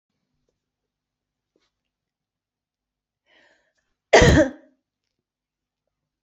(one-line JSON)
{"cough_length": "6.2 s", "cough_amplitude": 28133, "cough_signal_mean_std_ratio": 0.19, "survey_phase": "beta (2021-08-13 to 2022-03-07)", "age": "45-64", "gender": "Female", "wearing_mask": "No", "symptom_runny_or_blocked_nose": true, "symptom_shortness_of_breath": true, "symptom_sore_throat": true, "symptom_fatigue": true, "symptom_fever_high_temperature": true, "symptom_headache": true, "symptom_onset": "6 days", "smoker_status": "Never smoked", "respiratory_condition_asthma": false, "respiratory_condition_other": false, "recruitment_source": "Test and Trace", "submission_delay": "2 days", "covid_test_result": "Positive", "covid_test_method": "LAMP"}